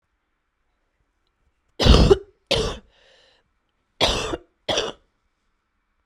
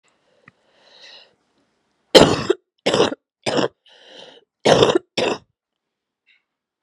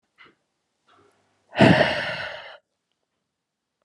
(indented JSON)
{
  "three_cough_length": "6.1 s",
  "three_cough_amplitude": 32768,
  "three_cough_signal_mean_std_ratio": 0.3,
  "cough_length": "6.8 s",
  "cough_amplitude": 32768,
  "cough_signal_mean_std_ratio": 0.31,
  "exhalation_length": "3.8 s",
  "exhalation_amplitude": 27090,
  "exhalation_signal_mean_std_ratio": 0.29,
  "survey_phase": "beta (2021-08-13 to 2022-03-07)",
  "age": "18-44",
  "gender": "Female",
  "wearing_mask": "No",
  "symptom_cough_any": true,
  "symptom_runny_or_blocked_nose": true,
  "symptom_shortness_of_breath": true,
  "symptom_sore_throat": true,
  "symptom_diarrhoea": true,
  "symptom_fatigue": true,
  "symptom_fever_high_temperature": true,
  "symptom_headache": true,
  "symptom_change_to_sense_of_smell_or_taste": true,
  "symptom_loss_of_taste": true,
  "symptom_other": true,
  "symptom_onset": "7 days",
  "smoker_status": "Never smoked",
  "respiratory_condition_asthma": false,
  "respiratory_condition_other": false,
  "recruitment_source": "Test and Trace",
  "submission_delay": "1 day",
  "covid_test_result": "Positive",
  "covid_test_method": "RT-qPCR",
  "covid_ct_value": 14.2,
  "covid_ct_gene": "ORF1ab gene",
  "covid_ct_mean": 14.7,
  "covid_viral_load": "15000000 copies/ml",
  "covid_viral_load_category": "High viral load (>1M copies/ml)"
}